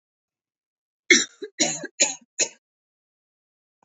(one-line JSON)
{"cough_length": "3.8 s", "cough_amplitude": 28435, "cough_signal_mean_std_ratio": 0.26, "survey_phase": "beta (2021-08-13 to 2022-03-07)", "age": "18-44", "gender": "Female", "wearing_mask": "No", "symptom_sore_throat": true, "symptom_onset": "12 days", "smoker_status": "Never smoked", "respiratory_condition_asthma": false, "respiratory_condition_other": false, "recruitment_source": "REACT", "submission_delay": "3 days", "covid_test_result": "Negative", "covid_test_method": "RT-qPCR", "influenza_a_test_result": "Negative", "influenza_b_test_result": "Negative"}